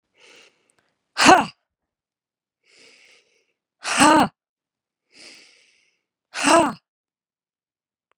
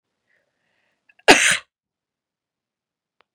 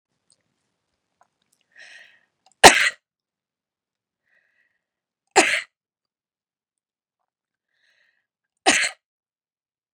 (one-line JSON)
{"exhalation_length": "8.2 s", "exhalation_amplitude": 32767, "exhalation_signal_mean_std_ratio": 0.26, "cough_length": "3.3 s", "cough_amplitude": 32768, "cough_signal_mean_std_ratio": 0.2, "three_cough_length": "9.9 s", "three_cough_amplitude": 32768, "three_cough_signal_mean_std_ratio": 0.17, "survey_phase": "beta (2021-08-13 to 2022-03-07)", "age": "18-44", "gender": "Female", "wearing_mask": "No", "symptom_none": true, "symptom_onset": "12 days", "smoker_status": "Never smoked", "respiratory_condition_asthma": true, "respiratory_condition_other": false, "recruitment_source": "REACT", "submission_delay": "1 day", "covid_test_result": "Negative", "covid_test_method": "RT-qPCR", "influenza_a_test_result": "Negative", "influenza_b_test_result": "Negative"}